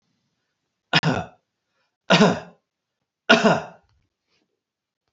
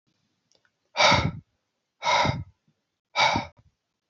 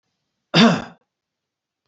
{
  "three_cough_length": "5.1 s",
  "three_cough_amplitude": 29384,
  "three_cough_signal_mean_std_ratio": 0.3,
  "exhalation_length": "4.1 s",
  "exhalation_amplitude": 17549,
  "exhalation_signal_mean_std_ratio": 0.39,
  "cough_length": "1.9 s",
  "cough_amplitude": 29680,
  "cough_signal_mean_std_ratio": 0.29,
  "survey_phase": "beta (2021-08-13 to 2022-03-07)",
  "age": "45-64",
  "gender": "Male",
  "wearing_mask": "No",
  "symptom_none": true,
  "smoker_status": "Never smoked",
  "respiratory_condition_asthma": false,
  "respiratory_condition_other": false,
  "recruitment_source": "REACT",
  "submission_delay": "1 day",
  "covid_test_result": "Negative",
  "covid_test_method": "RT-qPCR"
}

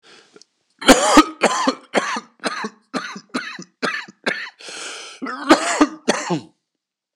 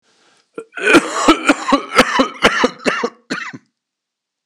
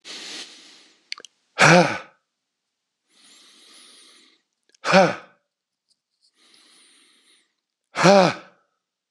{
  "three_cough_length": "7.2 s",
  "three_cough_amplitude": 26028,
  "three_cough_signal_mean_std_ratio": 0.42,
  "cough_length": "4.5 s",
  "cough_amplitude": 26028,
  "cough_signal_mean_std_ratio": 0.48,
  "exhalation_length": "9.1 s",
  "exhalation_amplitude": 26027,
  "exhalation_signal_mean_std_ratio": 0.27,
  "survey_phase": "beta (2021-08-13 to 2022-03-07)",
  "age": "45-64",
  "gender": "Male",
  "wearing_mask": "No",
  "symptom_cough_any": true,
  "symptom_shortness_of_breath": true,
  "symptom_sore_throat": true,
  "symptom_fatigue": true,
  "symptom_headache": true,
  "symptom_onset": "4 days",
  "smoker_status": "Ex-smoker",
  "respiratory_condition_asthma": false,
  "respiratory_condition_other": false,
  "recruitment_source": "Test and Trace",
  "submission_delay": "2 days",
  "covid_test_result": "Positive",
  "covid_test_method": "RT-qPCR",
  "covid_ct_value": 30.3,
  "covid_ct_gene": "N gene"
}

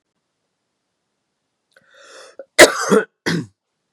{
  "cough_length": "3.9 s",
  "cough_amplitude": 32768,
  "cough_signal_mean_std_ratio": 0.25,
  "survey_phase": "beta (2021-08-13 to 2022-03-07)",
  "age": "45-64",
  "gender": "Male",
  "wearing_mask": "No",
  "symptom_cough_any": true,
  "symptom_runny_or_blocked_nose": true,
  "symptom_onset": "2 days",
  "smoker_status": "Ex-smoker",
  "respiratory_condition_asthma": false,
  "respiratory_condition_other": false,
  "recruitment_source": "Test and Trace",
  "submission_delay": "2 days",
  "covid_test_result": "Positive",
  "covid_test_method": "RT-qPCR"
}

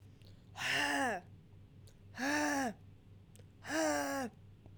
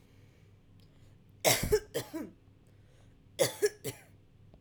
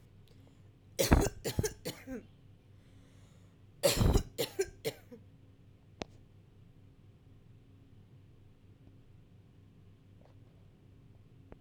{
  "exhalation_length": "4.8 s",
  "exhalation_amplitude": 2729,
  "exhalation_signal_mean_std_ratio": 0.64,
  "cough_length": "4.6 s",
  "cough_amplitude": 8096,
  "cough_signal_mean_std_ratio": 0.35,
  "three_cough_length": "11.6 s",
  "three_cough_amplitude": 12619,
  "three_cough_signal_mean_std_ratio": 0.31,
  "survey_phase": "alpha (2021-03-01 to 2021-08-12)",
  "age": "18-44",
  "gender": "Female",
  "wearing_mask": "No",
  "symptom_none": true,
  "smoker_status": "Current smoker (1 to 10 cigarettes per day)",
  "respiratory_condition_asthma": false,
  "respiratory_condition_other": false,
  "recruitment_source": "REACT",
  "submission_delay": "1 day",
  "covid_test_result": "Negative",
  "covid_test_method": "RT-qPCR"
}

